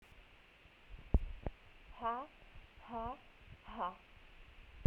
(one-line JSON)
{"exhalation_length": "4.9 s", "exhalation_amplitude": 5226, "exhalation_signal_mean_std_ratio": 0.36, "survey_phase": "beta (2021-08-13 to 2022-03-07)", "age": "18-44", "gender": "Female", "wearing_mask": "No", "symptom_fever_high_temperature": true, "symptom_headache": true, "symptom_change_to_sense_of_smell_or_taste": true, "symptom_loss_of_taste": true, "symptom_onset": "3 days", "smoker_status": "Ex-smoker", "respiratory_condition_asthma": false, "respiratory_condition_other": false, "recruitment_source": "Test and Trace", "submission_delay": "2 days", "covid_test_result": "Positive", "covid_test_method": "RT-qPCR", "covid_ct_value": 17.5, "covid_ct_gene": "ORF1ab gene", "covid_ct_mean": 17.9, "covid_viral_load": "1300000 copies/ml", "covid_viral_load_category": "High viral load (>1M copies/ml)"}